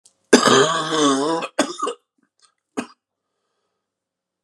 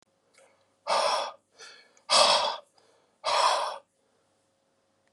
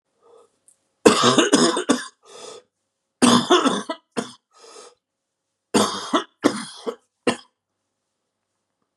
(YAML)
cough_length: 4.4 s
cough_amplitude: 32768
cough_signal_mean_std_ratio: 0.42
exhalation_length: 5.1 s
exhalation_amplitude: 16174
exhalation_signal_mean_std_ratio: 0.42
three_cough_length: 9.0 s
three_cough_amplitude: 32768
three_cough_signal_mean_std_ratio: 0.38
survey_phase: beta (2021-08-13 to 2022-03-07)
age: 18-44
gender: Male
wearing_mask: 'No'
symptom_cough_any: true
symptom_new_continuous_cough: true
symptom_runny_or_blocked_nose: true
symptom_sore_throat: true
symptom_fatigue: true
symptom_other: true
symptom_onset: 2 days
smoker_status: Current smoker (e-cigarettes or vapes only)
respiratory_condition_asthma: true
respiratory_condition_other: false
recruitment_source: Test and Trace
submission_delay: 1 day
covid_test_result: Positive
covid_test_method: RT-qPCR
covid_ct_value: 18.8
covid_ct_gene: ORF1ab gene
covid_ct_mean: 19.2
covid_viral_load: 490000 copies/ml
covid_viral_load_category: Low viral load (10K-1M copies/ml)